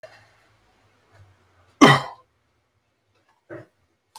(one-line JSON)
{"cough_length": "4.2 s", "cough_amplitude": 30653, "cough_signal_mean_std_ratio": 0.18, "survey_phase": "alpha (2021-03-01 to 2021-08-12)", "age": "65+", "gender": "Male", "wearing_mask": "No", "symptom_none": true, "smoker_status": "Ex-smoker", "respiratory_condition_asthma": false, "respiratory_condition_other": false, "recruitment_source": "REACT", "submission_delay": "2 days", "covid_test_result": "Negative", "covid_test_method": "RT-qPCR"}